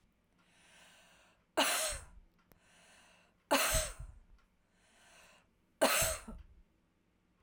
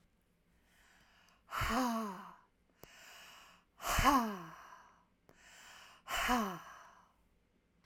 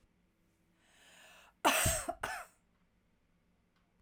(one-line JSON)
{"three_cough_length": "7.4 s", "three_cough_amplitude": 6050, "three_cough_signal_mean_std_ratio": 0.35, "exhalation_length": "7.9 s", "exhalation_amplitude": 6051, "exhalation_signal_mean_std_ratio": 0.41, "cough_length": "4.0 s", "cough_amplitude": 7511, "cough_signal_mean_std_ratio": 0.31, "survey_phase": "alpha (2021-03-01 to 2021-08-12)", "age": "45-64", "gender": "Female", "wearing_mask": "No", "symptom_none": true, "smoker_status": "Ex-smoker", "respiratory_condition_asthma": true, "respiratory_condition_other": false, "recruitment_source": "REACT", "submission_delay": "3 days", "covid_test_result": "Negative", "covid_test_method": "RT-qPCR"}